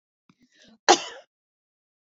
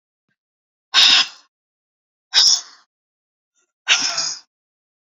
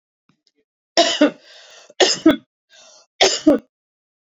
{"cough_length": "2.1 s", "cough_amplitude": 27298, "cough_signal_mean_std_ratio": 0.17, "exhalation_length": "5.0 s", "exhalation_amplitude": 31749, "exhalation_signal_mean_std_ratio": 0.34, "three_cough_length": "4.3 s", "three_cough_amplitude": 32683, "three_cough_signal_mean_std_ratio": 0.35, "survey_phase": "beta (2021-08-13 to 2022-03-07)", "age": "45-64", "gender": "Female", "wearing_mask": "No", "symptom_none": true, "smoker_status": "Never smoked", "respiratory_condition_asthma": false, "respiratory_condition_other": false, "recruitment_source": "REACT", "submission_delay": "4 days", "covid_test_result": "Negative", "covid_test_method": "RT-qPCR"}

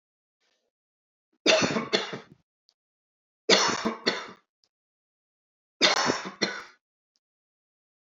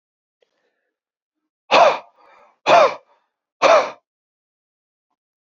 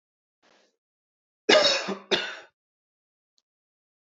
{"three_cough_length": "8.1 s", "three_cough_amplitude": 17404, "three_cough_signal_mean_std_ratio": 0.34, "exhalation_length": "5.5 s", "exhalation_amplitude": 27811, "exhalation_signal_mean_std_ratio": 0.3, "cough_length": "4.0 s", "cough_amplitude": 19854, "cough_signal_mean_std_ratio": 0.28, "survey_phase": "beta (2021-08-13 to 2022-03-07)", "age": "45-64", "gender": "Male", "wearing_mask": "No", "symptom_none": true, "smoker_status": "Never smoked", "respiratory_condition_asthma": false, "respiratory_condition_other": false, "recruitment_source": "REACT", "submission_delay": "6 days", "covid_test_result": "Negative", "covid_test_method": "RT-qPCR", "influenza_a_test_result": "Negative", "influenza_b_test_result": "Negative"}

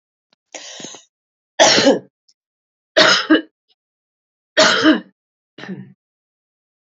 {"three_cough_length": "6.8 s", "three_cough_amplitude": 32767, "three_cough_signal_mean_std_ratio": 0.35, "survey_phase": "beta (2021-08-13 to 2022-03-07)", "age": "45-64", "gender": "Female", "wearing_mask": "No", "symptom_cough_any": true, "symptom_runny_or_blocked_nose": true, "symptom_onset": "8 days", "smoker_status": "Never smoked", "respiratory_condition_asthma": false, "respiratory_condition_other": false, "recruitment_source": "REACT", "submission_delay": "2 days", "covid_test_result": "Positive", "covid_test_method": "RT-qPCR", "covid_ct_value": 25.0, "covid_ct_gene": "E gene", "influenza_a_test_result": "Negative", "influenza_b_test_result": "Negative"}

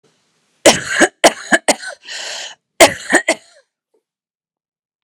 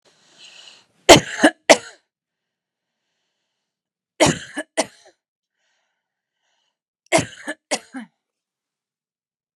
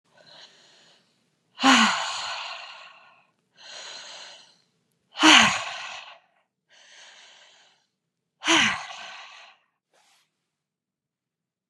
{"cough_length": "5.0 s", "cough_amplitude": 32768, "cough_signal_mean_std_ratio": 0.33, "three_cough_length": "9.6 s", "three_cough_amplitude": 32768, "three_cough_signal_mean_std_ratio": 0.2, "exhalation_length": "11.7 s", "exhalation_amplitude": 31777, "exhalation_signal_mean_std_ratio": 0.29, "survey_phase": "beta (2021-08-13 to 2022-03-07)", "age": "45-64", "gender": "Female", "wearing_mask": "No", "symptom_none": true, "smoker_status": "Ex-smoker", "respiratory_condition_asthma": false, "respiratory_condition_other": true, "recruitment_source": "REACT", "submission_delay": "1 day", "covid_test_result": "Negative", "covid_test_method": "RT-qPCR"}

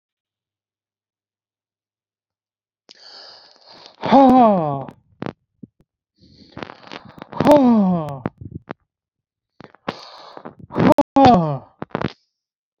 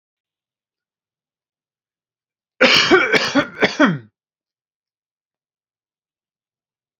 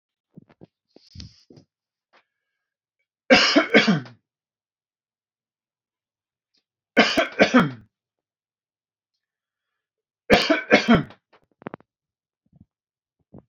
{"exhalation_length": "12.8 s", "exhalation_amplitude": 27648, "exhalation_signal_mean_std_ratio": 0.34, "cough_length": "7.0 s", "cough_amplitude": 30247, "cough_signal_mean_std_ratio": 0.3, "three_cough_length": "13.5 s", "three_cough_amplitude": 27481, "three_cough_signal_mean_std_ratio": 0.27, "survey_phase": "beta (2021-08-13 to 2022-03-07)", "age": "18-44", "gender": "Male", "wearing_mask": "No", "symptom_none": true, "smoker_status": "Never smoked", "respiratory_condition_asthma": false, "respiratory_condition_other": false, "recruitment_source": "REACT", "submission_delay": "6 days", "covid_test_result": "Negative", "covid_test_method": "RT-qPCR", "influenza_a_test_result": "Unknown/Void", "influenza_b_test_result": "Unknown/Void"}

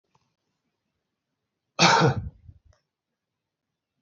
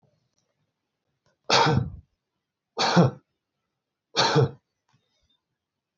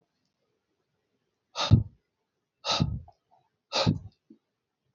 {"cough_length": "4.0 s", "cough_amplitude": 22802, "cough_signal_mean_std_ratio": 0.26, "three_cough_length": "6.0 s", "three_cough_amplitude": 16663, "three_cough_signal_mean_std_ratio": 0.34, "exhalation_length": "4.9 s", "exhalation_amplitude": 17302, "exhalation_signal_mean_std_ratio": 0.28, "survey_phase": "beta (2021-08-13 to 2022-03-07)", "age": "45-64", "gender": "Male", "wearing_mask": "No", "symptom_runny_or_blocked_nose": true, "symptom_sore_throat": true, "symptom_diarrhoea": true, "symptom_headache": true, "symptom_change_to_sense_of_smell_or_taste": true, "symptom_loss_of_taste": true, "symptom_onset": "7 days", "smoker_status": "Never smoked", "respiratory_condition_asthma": false, "respiratory_condition_other": true, "recruitment_source": "Test and Trace", "submission_delay": "2 days", "covid_test_result": "Positive", "covid_test_method": "RT-qPCR", "covid_ct_value": 15.0, "covid_ct_gene": "ORF1ab gene", "covid_ct_mean": 15.9, "covid_viral_load": "6100000 copies/ml", "covid_viral_load_category": "High viral load (>1M copies/ml)"}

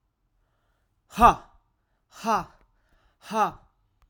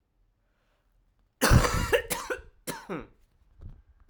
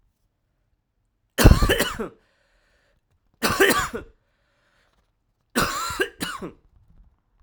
{"exhalation_length": "4.1 s", "exhalation_amplitude": 22008, "exhalation_signal_mean_std_ratio": 0.26, "cough_length": "4.1 s", "cough_amplitude": 14843, "cough_signal_mean_std_ratio": 0.35, "three_cough_length": "7.4 s", "three_cough_amplitude": 32768, "three_cough_signal_mean_std_ratio": 0.32, "survey_phase": "alpha (2021-03-01 to 2021-08-12)", "age": "18-44", "gender": "Male", "wearing_mask": "No", "symptom_cough_any": true, "symptom_shortness_of_breath": true, "symptom_fatigue": true, "symptom_headache": true, "symptom_change_to_sense_of_smell_or_taste": true, "symptom_onset": "6 days", "smoker_status": "Current smoker (1 to 10 cigarettes per day)", "respiratory_condition_asthma": true, "respiratory_condition_other": false, "recruitment_source": "Test and Trace", "submission_delay": "1 day", "covid_test_result": "Positive", "covid_test_method": "RT-qPCR"}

